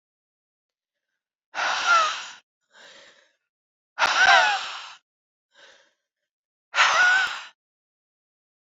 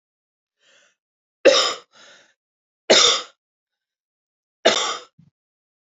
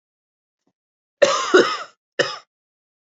{
  "exhalation_length": "8.8 s",
  "exhalation_amplitude": 19930,
  "exhalation_signal_mean_std_ratio": 0.38,
  "three_cough_length": "5.8 s",
  "three_cough_amplitude": 29793,
  "three_cough_signal_mean_std_ratio": 0.29,
  "cough_length": "3.1 s",
  "cough_amplitude": 27760,
  "cough_signal_mean_std_ratio": 0.32,
  "survey_phase": "beta (2021-08-13 to 2022-03-07)",
  "age": "18-44",
  "gender": "Female",
  "wearing_mask": "No",
  "symptom_cough_any": true,
  "symptom_new_continuous_cough": true,
  "symptom_runny_or_blocked_nose": true,
  "symptom_shortness_of_breath": true,
  "symptom_sore_throat": true,
  "symptom_fatigue": true,
  "symptom_fever_high_temperature": true,
  "symptom_headache": true,
  "symptom_change_to_sense_of_smell_or_taste": true,
  "symptom_loss_of_taste": true,
  "smoker_status": "Never smoked",
  "respiratory_condition_asthma": true,
  "respiratory_condition_other": false,
  "recruitment_source": "Test and Trace",
  "submission_delay": "2 days",
  "covid_test_result": "Positive",
  "covid_test_method": "RT-qPCR",
  "covid_ct_value": 17.4,
  "covid_ct_gene": "ORF1ab gene",
  "covid_ct_mean": 18.6,
  "covid_viral_load": "820000 copies/ml",
  "covid_viral_load_category": "Low viral load (10K-1M copies/ml)"
}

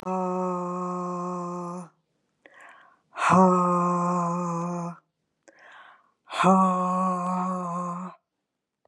{
  "exhalation_length": "8.9 s",
  "exhalation_amplitude": 17030,
  "exhalation_signal_mean_std_ratio": 0.63,
  "survey_phase": "beta (2021-08-13 to 2022-03-07)",
  "age": "45-64",
  "gender": "Female",
  "wearing_mask": "No",
  "symptom_none": true,
  "symptom_onset": "12 days",
  "smoker_status": "Never smoked",
  "respiratory_condition_asthma": false,
  "respiratory_condition_other": false,
  "recruitment_source": "REACT",
  "submission_delay": "1 day",
  "covid_test_result": "Negative",
  "covid_test_method": "RT-qPCR",
  "influenza_a_test_result": "Unknown/Void",
  "influenza_b_test_result": "Unknown/Void"
}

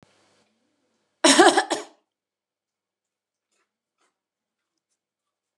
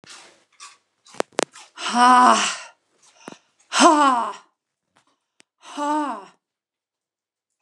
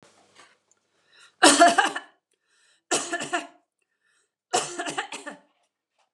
{
  "cough_length": "5.6 s",
  "cough_amplitude": 29074,
  "cough_signal_mean_std_ratio": 0.21,
  "exhalation_length": "7.6 s",
  "exhalation_amplitude": 29109,
  "exhalation_signal_mean_std_ratio": 0.37,
  "three_cough_length": "6.1 s",
  "three_cough_amplitude": 27344,
  "three_cough_signal_mean_std_ratio": 0.3,
  "survey_phase": "beta (2021-08-13 to 2022-03-07)",
  "age": "45-64",
  "gender": "Female",
  "wearing_mask": "No",
  "symptom_none": true,
  "smoker_status": "Never smoked",
  "respiratory_condition_asthma": false,
  "respiratory_condition_other": false,
  "recruitment_source": "REACT",
  "submission_delay": "2 days",
  "covid_test_result": "Negative",
  "covid_test_method": "RT-qPCR"
}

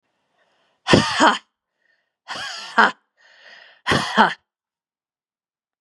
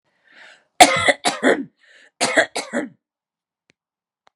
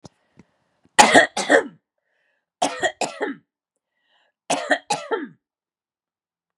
{
  "exhalation_length": "5.8 s",
  "exhalation_amplitude": 32768,
  "exhalation_signal_mean_std_ratio": 0.32,
  "cough_length": "4.4 s",
  "cough_amplitude": 32768,
  "cough_signal_mean_std_ratio": 0.33,
  "three_cough_length": "6.6 s",
  "three_cough_amplitude": 32768,
  "three_cough_signal_mean_std_ratio": 0.31,
  "survey_phase": "beta (2021-08-13 to 2022-03-07)",
  "age": "45-64",
  "gender": "Female",
  "wearing_mask": "No",
  "symptom_runny_or_blocked_nose": true,
  "symptom_headache": true,
  "symptom_change_to_sense_of_smell_or_taste": true,
  "symptom_other": true,
  "symptom_onset": "3 days",
  "smoker_status": "Never smoked",
  "respiratory_condition_asthma": false,
  "respiratory_condition_other": false,
  "recruitment_source": "Test and Trace",
  "submission_delay": "2 days",
  "covid_test_result": "Positive",
  "covid_test_method": "ePCR"
}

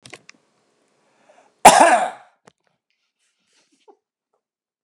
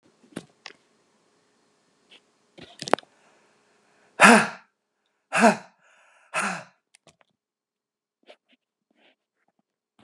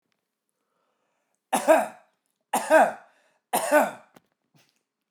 {
  "cough_length": "4.8 s",
  "cough_amplitude": 32768,
  "cough_signal_mean_std_ratio": 0.22,
  "exhalation_length": "10.0 s",
  "exhalation_amplitude": 31967,
  "exhalation_signal_mean_std_ratio": 0.19,
  "three_cough_length": "5.1 s",
  "three_cough_amplitude": 18236,
  "three_cough_signal_mean_std_ratio": 0.33,
  "survey_phase": "beta (2021-08-13 to 2022-03-07)",
  "age": "45-64",
  "gender": "Male",
  "wearing_mask": "No",
  "symptom_none": true,
  "smoker_status": "Never smoked",
  "respiratory_condition_asthma": false,
  "respiratory_condition_other": false,
  "recruitment_source": "REACT",
  "submission_delay": "1 day",
  "covid_test_result": "Negative",
  "covid_test_method": "RT-qPCR"
}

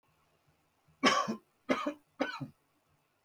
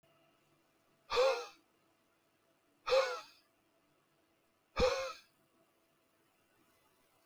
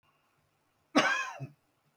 {
  "three_cough_length": "3.2 s",
  "three_cough_amplitude": 7939,
  "three_cough_signal_mean_std_ratio": 0.35,
  "exhalation_length": "7.3 s",
  "exhalation_amplitude": 3589,
  "exhalation_signal_mean_std_ratio": 0.3,
  "cough_length": "2.0 s",
  "cough_amplitude": 10182,
  "cough_signal_mean_std_ratio": 0.34,
  "survey_phase": "beta (2021-08-13 to 2022-03-07)",
  "age": "45-64",
  "gender": "Male",
  "wearing_mask": "No",
  "symptom_new_continuous_cough": true,
  "symptom_fatigue": true,
  "symptom_change_to_sense_of_smell_or_taste": true,
  "symptom_loss_of_taste": true,
  "symptom_onset": "5 days",
  "smoker_status": "Never smoked",
  "respiratory_condition_asthma": false,
  "respiratory_condition_other": false,
  "recruitment_source": "Test and Trace",
  "submission_delay": "1 day",
  "covid_test_result": "Positive",
  "covid_test_method": "RT-qPCR",
  "covid_ct_value": 32.3,
  "covid_ct_gene": "ORF1ab gene",
  "covid_ct_mean": 33.1,
  "covid_viral_load": "14 copies/ml",
  "covid_viral_load_category": "Minimal viral load (< 10K copies/ml)"
}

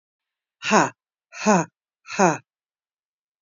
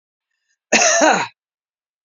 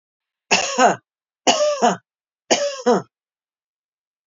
{
  "exhalation_length": "3.4 s",
  "exhalation_amplitude": 26255,
  "exhalation_signal_mean_std_ratio": 0.32,
  "cough_length": "2.0 s",
  "cough_amplitude": 30912,
  "cough_signal_mean_std_ratio": 0.42,
  "three_cough_length": "4.3 s",
  "three_cough_amplitude": 31579,
  "three_cough_signal_mean_std_ratio": 0.42,
  "survey_phase": "beta (2021-08-13 to 2022-03-07)",
  "age": "45-64",
  "gender": "Female",
  "wearing_mask": "No",
  "symptom_none": true,
  "smoker_status": "Current smoker (1 to 10 cigarettes per day)",
  "respiratory_condition_asthma": false,
  "respiratory_condition_other": false,
  "recruitment_source": "REACT",
  "submission_delay": "2 days",
  "covid_test_result": "Negative",
  "covid_test_method": "RT-qPCR",
  "influenza_a_test_result": "Negative",
  "influenza_b_test_result": "Negative"
}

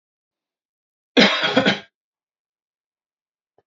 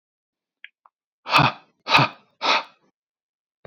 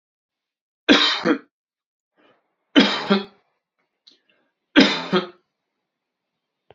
{
  "cough_length": "3.7 s",
  "cough_amplitude": 30177,
  "cough_signal_mean_std_ratio": 0.29,
  "exhalation_length": "3.7 s",
  "exhalation_amplitude": 27174,
  "exhalation_signal_mean_std_ratio": 0.31,
  "three_cough_length": "6.7 s",
  "three_cough_amplitude": 32744,
  "three_cough_signal_mean_std_ratio": 0.31,
  "survey_phase": "beta (2021-08-13 to 2022-03-07)",
  "age": "18-44",
  "gender": "Male",
  "wearing_mask": "No",
  "symptom_none": true,
  "smoker_status": "Never smoked",
  "respiratory_condition_asthma": false,
  "respiratory_condition_other": false,
  "recruitment_source": "REACT",
  "submission_delay": "1 day",
  "covid_test_result": "Negative",
  "covid_test_method": "RT-qPCR",
  "influenza_a_test_result": "Negative",
  "influenza_b_test_result": "Negative"
}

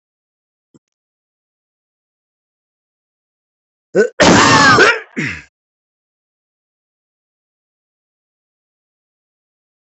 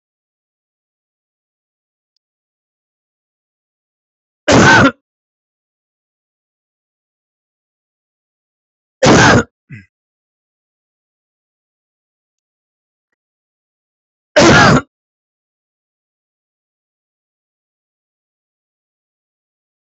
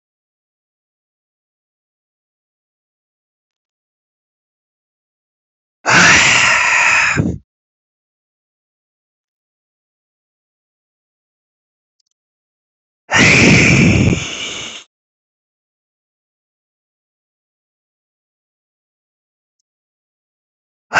{
  "cough_length": "9.9 s",
  "cough_amplitude": 32768,
  "cough_signal_mean_std_ratio": 0.27,
  "three_cough_length": "19.9 s",
  "three_cough_amplitude": 32768,
  "three_cough_signal_mean_std_ratio": 0.22,
  "exhalation_length": "21.0 s",
  "exhalation_amplitude": 31354,
  "exhalation_signal_mean_std_ratio": 0.3,
  "survey_phase": "beta (2021-08-13 to 2022-03-07)",
  "age": "45-64",
  "gender": "Male",
  "wearing_mask": "No",
  "symptom_runny_or_blocked_nose": true,
  "symptom_sore_throat": true,
  "smoker_status": "Ex-smoker",
  "respiratory_condition_asthma": false,
  "respiratory_condition_other": false,
  "recruitment_source": "REACT",
  "submission_delay": "3 days",
  "covid_test_result": "Negative",
  "covid_test_method": "RT-qPCR",
  "influenza_a_test_result": "Negative",
  "influenza_b_test_result": "Negative"
}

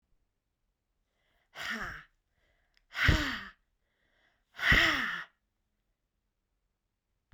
{
  "exhalation_length": "7.3 s",
  "exhalation_amplitude": 8785,
  "exhalation_signal_mean_std_ratio": 0.31,
  "survey_phase": "beta (2021-08-13 to 2022-03-07)",
  "age": "65+",
  "gender": "Female",
  "wearing_mask": "No",
  "symptom_none": true,
  "smoker_status": "Never smoked",
  "respiratory_condition_asthma": false,
  "respiratory_condition_other": false,
  "recruitment_source": "REACT",
  "submission_delay": "1 day",
  "covid_test_result": "Negative",
  "covid_test_method": "RT-qPCR"
}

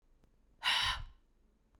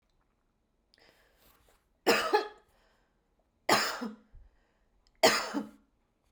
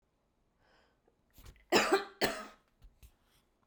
{
  "exhalation_length": "1.8 s",
  "exhalation_amplitude": 3669,
  "exhalation_signal_mean_std_ratio": 0.41,
  "three_cough_length": "6.3 s",
  "three_cough_amplitude": 11922,
  "three_cough_signal_mean_std_ratio": 0.31,
  "cough_length": "3.7 s",
  "cough_amplitude": 8022,
  "cough_signal_mean_std_ratio": 0.29,
  "survey_phase": "beta (2021-08-13 to 2022-03-07)",
  "age": "45-64",
  "gender": "Female",
  "wearing_mask": "No",
  "symptom_none": true,
  "smoker_status": "Never smoked",
  "respiratory_condition_asthma": false,
  "respiratory_condition_other": false,
  "recruitment_source": "REACT",
  "submission_delay": "3 days",
  "covid_test_result": "Negative",
  "covid_test_method": "RT-qPCR",
  "influenza_a_test_result": "Negative",
  "influenza_b_test_result": "Negative"
}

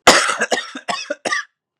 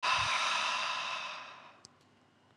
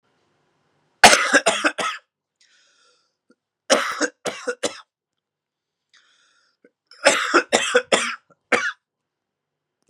{
  "cough_length": "1.8 s",
  "cough_amplitude": 32768,
  "cough_signal_mean_std_ratio": 0.49,
  "exhalation_length": "2.6 s",
  "exhalation_amplitude": 4598,
  "exhalation_signal_mean_std_ratio": 0.7,
  "three_cough_length": "9.9 s",
  "three_cough_amplitude": 32768,
  "three_cough_signal_mean_std_ratio": 0.33,
  "survey_phase": "beta (2021-08-13 to 2022-03-07)",
  "age": "18-44",
  "gender": "Male",
  "wearing_mask": "No",
  "symptom_cough_any": true,
  "symptom_new_continuous_cough": true,
  "symptom_onset": "12 days",
  "smoker_status": "Never smoked",
  "respiratory_condition_asthma": false,
  "respiratory_condition_other": false,
  "recruitment_source": "REACT",
  "submission_delay": "1 day",
  "covid_test_result": "Negative",
  "covid_test_method": "RT-qPCR"
}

